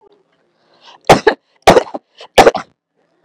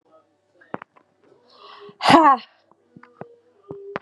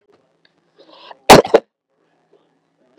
{"three_cough_length": "3.2 s", "three_cough_amplitude": 32768, "three_cough_signal_mean_std_ratio": 0.31, "exhalation_length": "4.0 s", "exhalation_amplitude": 32767, "exhalation_signal_mean_std_ratio": 0.26, "cough_length": "3.0 s", "cough_amplitude": 32768, "cough_signal_mean_std_ratio": 0.21, "survey_phase": "beta (2021-08-13 to 2022-03-07)", "age": "18-44", "gender": "Female", "wearing_mask": "No", "symptom_cough_any": true, "symptom_diarrhoea": true, "symptom_fatigue": true, "symptom_fever_high_temperature": true, "symptom_change_to_sense_of_smell_or_taste": true, "symptom_loss_of_taste": true, "symptom_onset": "15 days", "smoker_status": "Never smoked", "respiratory_condition_asthma": false, "respiratory_condition_other": false, "recruitment_source": "Test and Trace", "submission_delay": "3 days", "covid_test_result": "Positive", "covid_test_method": "RT-qPCR", "covid_ct_value": 27.1, "covid_ct_gene": "ORF1ab gene", "covid_ct_mean": 27.6, "covid_viral_load": "890 copies/ml", "covid_viral_load_category": "Minimal viral load (< 10K copies/ml)"}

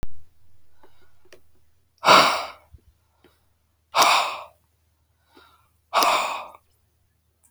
{"exhalation_length": "7.5 s", "exhalation_amplitude": 32768, "exhalation_signal_mean_std_ratio": 0.36, "survey_phase": "beta (2021-08-13 to 2022-03-07)", "age": "45-64", "gender": "Male", "wearing_mask": "No", "symptom_cough_any": true, "symptom_runny_or_blocked_nose": true, "symptom_fatigue": true, "symptom_fever_high_temperature": true, "symptom_headache": true, "smoker_status": "Never smoked", "respiratory_condition_asthma": false, "respiratory_condition_other": false, "recruitment_source": "Test and Trace", "submission_delay": "2 days", "covid_test_result": "Positive", "covid_test_method": "LFT"}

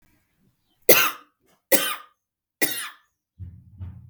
{"three_cough_length": "4.1 s", "three_cough_amplitude": 32768, "three_cough_signal_mean_std_ratio": 0.29, "survey_phase": "beta (2021-08-13 to 2022-03-07)", "age": "18-44", "gender": "Female", "wearing_mask": "No", "symptom_none": true, "symptom_onset": "6 days", "smoker_status": "Ex-smoker", "respiratory_condition_asthma": false, "respiratory_condition_other": false, "recruitment_source": "REACT", "submission_delay": "2 days", "covid_test_result": "Negative", "covid_test_method": "RT-qPCR", "influenza_a_test_result": "Negative", "influenza_b_test_result": "Negative"}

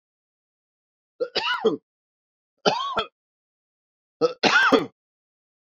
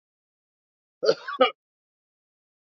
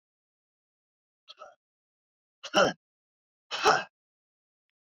{"three_cough_length": "5.7 s", "three_cough_amplitude": 26812, "three_cough_signal_mean_std_ratio": 0.36, "cough_length": "2.7 s", "cough_amplitude": 16783, "cough_signal_mean_std_ratio": 0.23, "exhalation_length": "4.9 s", "exhalation_amplitude": 12352, "exhalation_signal_mean_std_ratio": 0.23, "survey_phase": "beta (2021-08-13 to 2022-03-07)", "age": "45-64", "gender": "Male", "wearing_mask": "No", "symptom_cough_any": true, "symptom_runny_or_blocked_nose": true, "symptom_sore_throat": true, "symptom_fatigue": true, "symptom_headache": true, "symptom_loss_of_taste": true, "symptom_onset": "10 days", "smoker_status": "Never smoked", "respiratory_condition_asthma": false, "respiratory_condition_other": true, "recruitment_source": "Test and Trace", "submission_delay": "2 days", "covid_test_result": "Positive", "covid_test_method": "RT-qPCR", "covid_ct_value": 33.0, "covid_ct_gene": "N gene"}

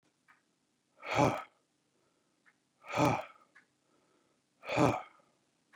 {"exhalation_length": "5.8 s", "exhalation_amplitude": 6797, "exhalation_signal_mean_std_ratio": 0.3, "survey_phase": "beta (2021-08-13 to 2022-03-07)", "age": "45-64", "gender": "Male", "wearing_mask": "No", "symptom_none": true, "smoker_status": "Ex-smoker", "respiratory_condition_asthma": false, "respiratory_condition_other": false, "recruitment_source": "REACT", "submission_delay": "2 days", "covid_test_result": "Negative", "covid_test_method": "RT-qPCR", "influenza_a_test_result": "Negative", "influenza_b_test_result": "Negative"}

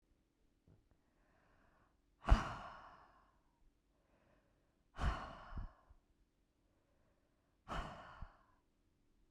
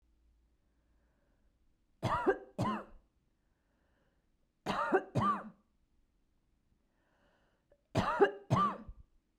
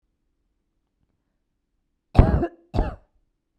{"exhalation_length": "9.3 s", "exhalation_amplitude": 5135, "exhalation_signal_mean_std_ratio": 0.22, "three_cough_length": "9.4 s", "three_cough_amplitude": 7125, "three_cough_signal_mean_std_ratio": 0.35, "cough_length": "3.6 s", "cough_amplitude": 32768, "cough_signal_mean_std_ratio": 0.23, "survey_phase": "beta (2021-08-13 to 2022-03-07)", "age": "18-44", "gender": "Female", "wearing_mask": "No", "symptom_none": true, "smoker_status": "Never smoked", "respiratory_condition_asthma": false, "respiratory_condition_other": false, "recruitment_source": "REACT", "submission_delay": "0 days", "covid_test_result": "Negative", "covid_test_method": "RT-qPCR"}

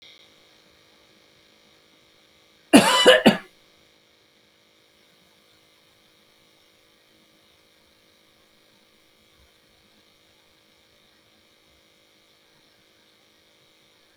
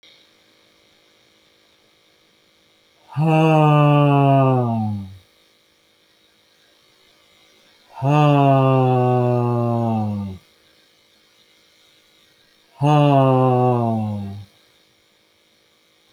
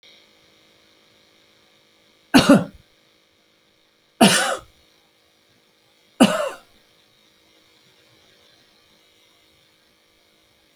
{"cough_length": "14.2 s", "cough_amplitude": 32767, "cough_signal_mean_std_ratio": 0.17, "exhalation_length": "16.1 s", "exhalation_amplitude": 24437, "exhalation_signal_mean_std_ratio": 0.5, "three_cough_length": "10.8 s", "three_cough_amplitude": 30723, "three_cough_signal_mean_std_ratio": 0.22, "survey_phase": "beta (2021-08-13 to 2022-03-07)", "age": "65+", "gender": "Male", "wearing_mask": "No", "symptom_none": true, "smoker_status": "Never smoked", "respiratory_condition_asthma": false, "respiratory_condition_other": false, "recruitment_source": "REACT", "submission_delay": "1 day", "covid_test_result": "Negative", "covid_test_method": "RT-qPCR"}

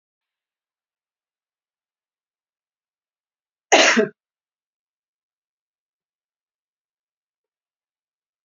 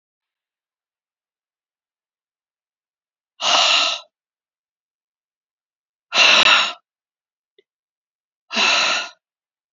{"cough_length": "8.4 s", "cough_amplitude": 28928, "cough_signal_mean_std_ratio": 0.16, "exhalation_length": "9.7 s", "exhalation_amplitude": 29944, "exhalation_signal_mean_std_ratio": 0.32, "survey_phase": "beta (2021-08-13 to 2022-03-07)", "age": "45-64", "gender": "Female", "wearing_mask": "No", "symptom_runny_or_blocked_nose": true, "symptom_headache": true, "symptom_onset": "13 days", "smoker_status": "Never smoked", "respiratory_condition_asthma": false, "respiratory_condition_other": false, "recruitment_source": "REACT", "submission_delay": "1 day", "covid_test_result": "Negative", "covid_test_method": "RT-qPCR", "influenza_a_test_result": "Negative", "influenza_b_test_result": "Negative"}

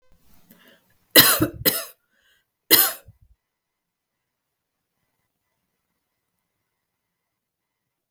{"three_cough_length": "8.1 s", "three_cough_amplitude": 32768, "three_cough_signal_mean_std_ratio": 0.21, "survey_phase": "beta (2021-08-13 to 2022-03-07)", "age": "18-44", "gender": "Female", "wearing_mask": "No", "symptom_runny_or_blocked_nose": true, "symptom_sore_throat": true, "smoker_status": "Never smoked", "respiratory_condition_asthma": false, "respiratory_condition_other": false, "recruitment_source": "REACT", "submission_delay": "2 days", "covid_test_result": "Negative", "covid_test_method": "RT-qPCR", "influenza_a_test_result": "Negative", "influenza_b_test_result": "Negative"}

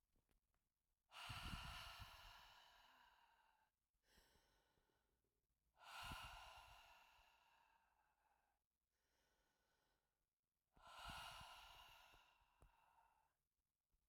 {"exhalation_length": "14.1 s", "exhalation_amplitude": 351, "exhalation_signal_mean_std_ratio": 0.47, "survey_phase": "alpha (2021-03-01 to 2021-08-12)", "age": "65+", "gender": "Female", "wearing_mask": "No", "symptom_fatigue": true, "symptom_headache": true, "symptom_change_to_sense_of_smell_or_taste": true, "symptom_loss_of_taste": true, "symptom_onset": "3 days", "smoker_status": "Ex-smoker", "respiratory_condition_asthma": false, "respiratory_condition_other": false, "recruitment_source": "Test and Trace", "submission_delay": "2 days", "covid_test_result": "Positive", "covid_test_method": "RT-qPCR", "covid_ct_value": 19.1, "covid_ct_gene": "ORF1ab gene", "covid_ct_mean": 19.5, "covid_viral_load": "400000 copies/ml", "covid_viral_load_category": "Low viral load (10K-1M copies/ml)"}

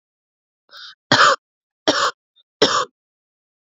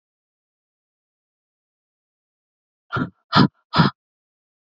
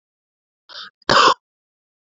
{"three_cough_length": "3.7 s", "three_cough_amplitude": 32767, "three_cough_signal_mean_std_ratio": 0.34, "exhalation_length": "4.6 s", "exhalation_amplitude": 31980, "exhalation_signal_mean_std_ratio": 0.22, "cough_length": "2.0 s", "cough_amplitude": 29732, "cough_signal_mean_std_ratio": 0.29, "survey_phase": "beta (2021-08-13 to 2022-03-07)", "age": "18-44", "gender": "Female", "wearing_mask": "No", "symptom_cough_any": true, "symptom_headache": true, "symptom_onset": "6 days", "smoker_status": "Current smoker (1 to 10 cigarettes per day)", "respiratory_condition_asthma": false, "respiratory_condition_other": false, "recruitment_source": "Test and Trace", "submission_delay": "4 days", "covid_test_result": "Positive", "covid_test_method": "RT-qPCR", "covid_ct_value": 27.7, "covid_ct_gene": "N gene"}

